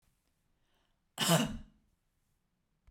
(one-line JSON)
{"cough_length": "2.9 s", "cough_amplitude": 6750, "cough_signal_mean_std_ratio": 0.28, "survey_phase": "beta (2021-08-13 to 2022-03-07)", "age": "45-64", "gender": "Female", "wearing_mask": "No", "symptom_none": true, "smoker_status": "Ex-smoker", "respiratory_condition_asthma": true, "respiratory_condition_other": false, "recruitment_source": "REACT", "submission_delay": "1 day", "covid_test_result": "Negative", "covid_test_method": "RT-qPCR"}